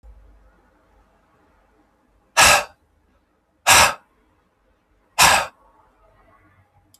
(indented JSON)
{
  "exhalation_length": "7.0 s",
  "exhalation_amplitude": 32768,
  "exhalation_signal_mean_std_ratio": 0.27,
  "survey_phase": "alpha (2021-03-01 to 2021-08-12)",
  "age": "45-64",
  "gender": "Male",
  "wearing_mask": "No",
  "symptom_none": true,
  "smoker_status": "Ex-smoker",
  "respiratory_condition_asthma": true,
  "respiratory_condition_other": false,
  "recruitment_source": "REACT",
  "submission_delay": "1 day",
  "covid_test_result": "Negative",
  "covid_test_method": "RT-qPCR"
}